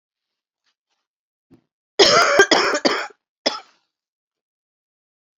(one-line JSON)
{"cough_length": "5.4 s", "cough_amplitude": 30852, "cough_signal_mean_std_ratio": 0.33, "survey_phase": "beta (2021-08-13 to 2022-03-07)", "age": "45-64", "gender": "Female", "wearing_mask": "No", "symptom_cough_any": true, "symptom_sore_throat": true, "symptom_headache": true, "symptom_onset": "9 days", "smoker_status": "Never smoked", "respiratory_condition_asthma": false, "respiratory_condition_other": false, "recruitment_source": "Test and Trace", "submission_delay": "2 days", "covid_test_result": "Positive", "covid_test_method": "RT-qPCR", "covid_ct_value": 16.1, "covid_ct_gene": "ORF1ab gene", "covid_ct_mean": 16.4, "covid_viral_load": "4100000 copies/ml", "covid_viral_load_category": "High viral load (>1M copies/ml)"}